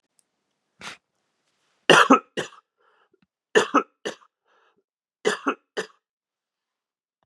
{"three_cough_length": "7.3 s", "three_cough_amplitude": 30185, "three_cough_signal_mean_std_ratio": 0.23, "survey_phase": "beta (2021-08-13 to 2022-03-07)", "age": "45-64", "gender": "Male", "wearing_mask": "No", "symptom_cough_any": true, "symptom_runny_or_blocked_nose": true, "smoker_status": "Never smoked", "respiratory_condition_asthma": false, "respiratory_condition_other": false, "recruitment_source": "Test and Trace", "submission_delay": "2 days", "covid_test_result": "Positive", "covid_test_method": "LFT"}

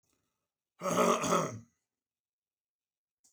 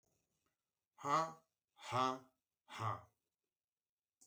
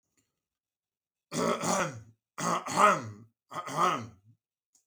{"cough_length": "3.3 s", "cough_amplitude": 6497, "cough_signal_mean_std_ratio": 0.36, "exhalation_length": "4.3 s", "exhalation_amplitude": 2281, "exhalation_signal_mean_std_ratio": 0.33, "three_cough_length": "4.9 s", "three_cough_amplitude": 12389, "three_cough_signal_mean_std_ratio": 0.44, "survey_phase": "beta (2021-08-13 to 2022-03-07)", "age": "45-64", "gender": "Male", "wearing_mask": "No", "symptom_none": true, "smoker_status": "Never smoked", "respiratory_condition_asthma": false, "respiratory_condition_other": false, "recruitment_source": "REACT", "submission_delay": "1 day", "covid_test_result": "Negative", "covid_test_method": "RT-qPCR"}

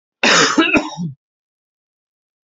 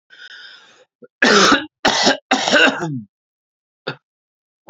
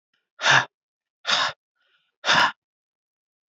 {"cough_length": "2.5 s", "cough_amplitude": 30947, "cough_signal_mean_std_ratio": 0.44, "three_cough_length": "4.7 s", "three_cough_amplitude": 32073, "three_cough_signal_mean_std_ratio": 0.44, "exhalation_length": "3.5 s", "exhalation_amplitude": 21111, "exhalation_signal_mean_std_ratio": 0.35, "survey_phase": "beta (2021-08-13 to 2022-03-07)", "age": "18-44", "gender": "Male", "wearing_mask": "No", "symptom_runny_or_blocked_nose": true, "smoker_status": "Never smoked", "recruitment_source": "Test and Trace", "submission_delay": "2 days", "covid_test_result": "Positive", "covid_test_method": "RT-qPCR", "covid_ct_value": 22.4, "covid_ct_gene": "N gene", "covid_ct_mean": 22.7, "covid_viral_load": "36000 copies/ml", "covid_viral_load_category": "Low viral load (10K-1M copies/ml)"}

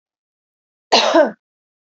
{"cough_length": "2.0 s", "cough_amplitude": 31863, "cough_signal_mean_std_ratio": 0.34, "survey_phase": "beta (2021-08-13 to 2022-03-07)", "age": "18-44", "gender": "Female", "wearing_mask": "No", "symptom_none": true, "smoker_status": "Never smoked", "respiratory_condition_asthma": true, "respiratory_condition_other": false, "recruitment_source": "REACT", "submission_delay": "2 days", "covid_test_result": "Negative", "covid_test_method": "RT-qPCR", "influenza_a_test_result": "Negative", "influenza_b_test_result": "Negative"}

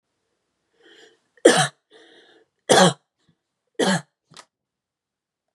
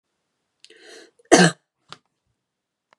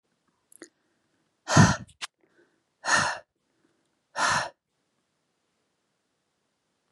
{"three_cough_length": "5.5 s", "three_cough_amplitude": 32304, "three_cough_signal_mean_std_ratio": 0.26, "cough_length": "3.0 s", "cough_amplitude": 32765, "cough_signal_mean_std_ratio": 0.2, "exhalation_length": "6.9 s", "exhalation_amplitude": 21461, "exhalation_signal_mean_std_ratio": 0.26, "survey_phase": "beta (2021-08-13 to 2022-03-07)", "age": "18-44", "gender": "Female", "wearing_mask": "No", "symptom_fatigue": true, "smoker_status": "Never smoked", "respiratory_condition_asthma": false, "respiratory_condition_other": false, "recruitment_source": "REACT", "submission_delay": "0 days", "covid_test_result": "Negative", "covid_test_method": "RT-qPCR", "influenza_a_test_result": "Negative", "influenza_b_test_result": "Negative"}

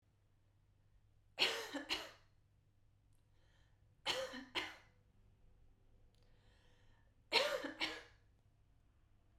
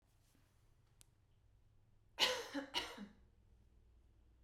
{"three_cough_length": "9.4 s", "three_cough_amplitude": 3597, "three_cough_signal_mean_std_ratio": 0.34, "cough_length": "4.4 s", "cough_amplitude": 3684, "cough_signal_mean_std_ratio": 0.32, "survey_phase": "beta (2021-08-13 to 2022-03-07)", "age": "18-44", "gender": "Female", "wearing_mask": "No", "symptom_headache": true, "smoker_status": "Never smoked", "respiratory_condition_asthma": true, "respiratory_condition_other": false, "recruitment_source": "REACT", "submission_delay": "1 day", "covid_test_result": "Negative", "covid_test_method": "RT-qPCR"}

